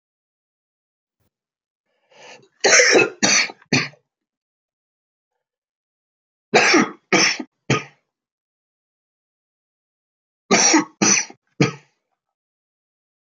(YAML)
three_cough_length: 13.3 s
three_cough_amplitude: 32292
three_cough_signal_mean_std_ratio: 0.33
survey_phase: beta (2021-08-13 to 2022-03-07)
age: 65+
gender: Male
wearing_mask: 'No'
symptom_cough_any: true
symptom_shortness_of_breath: true
symptom_fatigue: true
symptom_change_to_sense_of_smell_or_taste: true
symptom_other: true
symptom_onset: 4 days
smoker_status: Never smoked
respiratory_condition_asthma: true
respiratory_condition_other: false
recruitment_source: Test and Trace
submission_delay: 1 day
covid_test_result: Positive
covid_test_method: RT-qPCR
covid_ct_value: 16.3
covid_ct_gene: ORF1ab gene
covid_ct_mean: 16.4
covid_viral_load: 4000000 copies/ml
covid_viral_load_category: High viral load (>1M copies/ml)